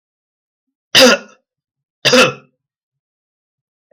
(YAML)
cough_length: 3.9 s
cough_amplitude: 32766
cough_signal_mean_std_ratio: 0.3
survey_phase: beta (2021-08-13 to 2022-03-07)
age: 65+
gender: Male
wearing_mask: 'No'
symptom_none: true
smoker_status: Never smoked
respiratory_condition_asthma: true
respiratory_condition_other: false
recruitment_source: REACT
submission_delay: 1 day
covid_test_result: Negative
covid_test_method: RT-qPCR
influenza_a_test_result: Negative
influenza_b_test_result: Negative